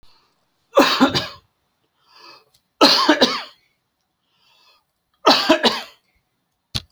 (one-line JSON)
{"three_cough_length": "6.9 s", "three_cough_amplitude": 32768, "three_cough_signal_mean_std_ratio": 0.36, "survey_phase": "beta (2021-08-13 to 2022-03-07)", "age": "65+", "gender": "Male", "wearing_mask": "No", "symptom_none": true, "smoker_status": "Ex-smoker", "respiratory_condition_asthma": false, "respiratory_condition_other": false, "recruitment_source": "REACT", "submission_delay": "2 days", "covid_test_result": "Negative", "covid_test_method": "RT-qPCR"}